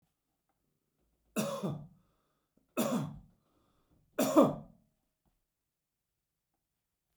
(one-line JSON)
{"three_cough_length": "7.2 s", "three_cough_amplitude": 8827, "three_cough_signal_mean_std_ratio": 0.28, "survey_phase": "beta (2021-08-13 to 2022-03-07)", "age": "65+", "gender": "Male", "wearing_mask": "No", "symptom_none": true, "smoker_status": "Never smoked", "respiratory_condition_asthma": false, "respiratory_condition_other": false, "recruitment_source": "REACT", "submission_delay": "1 day", "covid_test_result": "Negative", "covid_test_method": "RT-qPCR"}